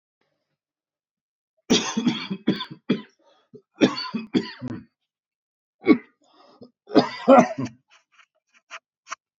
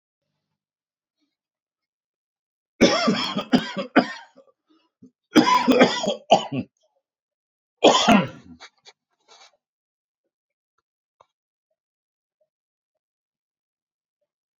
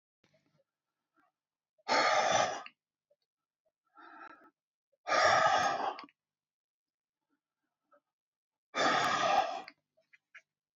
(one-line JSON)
{"three_cough_length": "9.4 s", "three_cough_amplitude": 26660, "three_cough_signal_mean_std_ratio": 0.3, "cough_length": "14.6 s", "cough_amplitude": 27582, "cough_signal_mean_std_ratio": 0.29, "exhalation_length": "10.8 s", "exhalation_amplitude": 6274, "exhalation_signal_mean_std_ratio": 0.39, "survey_phase": "beta (2021-08-13 to 2022-03-07)", "age": "65+", "gender": "Male", "wearing_mask": "No", "symptom_none": true, "smoker_status": "Ex-smoker", "respiratory_condition_asthma": false, "respiratory_condition_other": false, "recruitment_source": "REACT", "submission_delay": "1 day", "covid_test_result": "Negative", "covid_test_method": "RT-qPCR", "influenza_a_test_result": "Negative", "influenza_b_test_result": "Negative"}